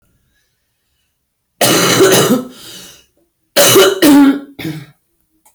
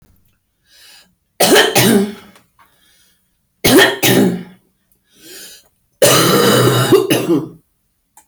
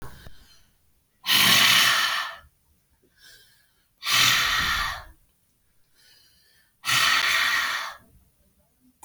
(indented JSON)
{
  "cough_length": "5.5 s",
  "cough_amplitude": 32768,
  "cough_signal_mean_std_ratio": 0.5,
  "three_cough_length": "8.3 s",
  "three_cough_amplitude": 32768,
  "three_cough_signal_mean_std_ratio": 0.51,
  "exhalation_length": "9.0 s",
  "exhalation_amplitude": 18160,
  "exhalation_signal_mean_std_ratio": 0.49,
  "survey_phase": "alpha (2021-03-01 to 2021-08-12)",
  "age": "45-64",
  "gender": "Female",
  "wearing_mask": "No",
  "symptom_fatigue": true,
  "symptom_headache": true,
  "smoker_status": "Current smoker (11 or more cigarettes per day)",
  "respiratory_condition_asthma": false,
  "respiratory_condition_other": false,
  "recruitment_source": "REACT",
  "submission_delay": "10 days",
  "covid_test_result": "Negative",
  "covid_test_method": "RT-qPCR"
}